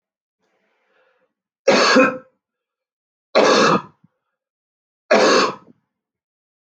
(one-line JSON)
{"three_cough_length": "6.7 s", "three_cough_amplitude": 27743, "three_cough_signal_mean_std_ratio": 0.38, "survey_phase": "beta (2021-08-13 to 2022-03-07)", "age": "45-64", "gender": "Male", "wearing_mask": "No", "symptom_none": true, "smoker_status": "Never smoked", "respiratory_condition_asthma": false, "respiratory_condition_other": false, "recruitment_source": "REACT", "submission_delay": "0 days", "covid_test_result": "Negative", "covid_test_method": "RT-qPCR"}